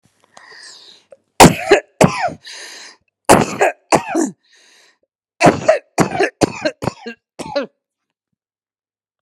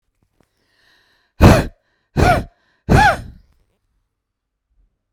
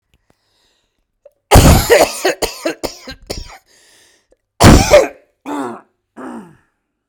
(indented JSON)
{
  "three_cough_length": "9.2 s",
  "three_cough_amplitude": 32768,
  "three_cough_signal_mean_std_ratio": 0.35,
  "exhalation_length": "5.1 s",
  "exhalation_amplitude": 32768,
  "exhalation_signal_mean_std_ratio": 0.31,
  "cough_length": "7.1 s",
  "cough_amplitude": 32768,
  "cough_signal_mean_std_ratio": 0.37,
  "survey_phase": "beta (2021-08-13 to 2022-03-07)",
  "age": "45-64",
  "gender": "Female",
  "wearing_mask": "No",
  "symptom_cough_any": true,
  "symptom_runny_or_blocked_nose": true,
  "symptom_shortness_of_breath": true,
  "symptom_sore_throat": true,
  "symptom_abdominal_pain": true,
  "symptom_diarrhoea": true,
  "symptom_fatigue": true,
  "symptom_headache": true,
  "symptom_other": true,
  "symptom_onset": "5 days",
  "smoker_status": "Never smoked",
  "respiratory_condition_asthma": false,
  "respiratory_condition_other": false,
  "recruitment_source": "REACT",
  "submission_delay": "1 day",
  "covid_test_result": "Negative",
  "covid_test_method": "RT-qPCR"
}